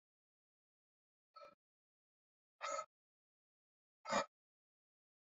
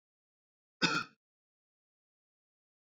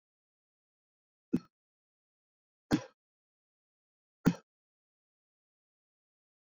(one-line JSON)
{"exhalation_length": "5.3 s", "exhalation_amplitude": 1934, "exhalation_signal_mean_std_ratio": 0.21, "cough_length": "3.0 s", "cough_amplitude": 5974, "cough_signal_mean_std_ratio": 0.2, "three_cough_length": "6.5 s", "three_cough_amplitude": 6966, "three_cough_signal_mean_std_ratio": 0.13, "survey_phase": "beta (2021-08-13 to 2022-03-07)", "age": "65+", "gender": "Male", "wearing_mask": "No", "symptom_none": true, "smoker_status": "Never smoked", "respiratory_condition_asthma": false, "respiratory_condition_other": false, "recruitment_source": "REACT", "submission_delay": "2 days", "covid_test_result": "Negative", "covid_test_method": "RT-qPCR"}